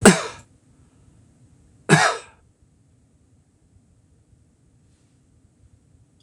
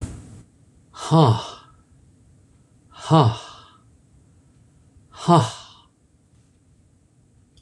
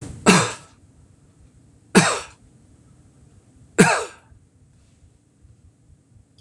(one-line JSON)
{"cough_length": "6.2 s", "cough_amplitude": 26028, "cough_signal_mean_std_ratio": 0.21, "exhalation_length": "7.6 s", "exhalation_amplitude": 25466, "exhalation_signal_mean_std_ratio": 0.29, "three_cough_length": "6.4 s", "three_cough_amplitude": 26028, "three_cough_signal_mean_std_ratio": 0.28, "survey_phase": "beta (2021-08-13 to 2022-03-07)", "age": "65+", "gender": "Male", "wearing_mask": "No", "symptom_none": true, "smoker_status": "Never smoked", "respiratory_condition_asthma": false, "respiratory_condition_other": false, "recruitment_source": "REACT", "submission_delay": "2 days", "covid_test_result": "Negative", "covid_test_method": "RT-qPCR", "influenza_a_test_result": "Negative", "influenza_b_test_result": "Negative"}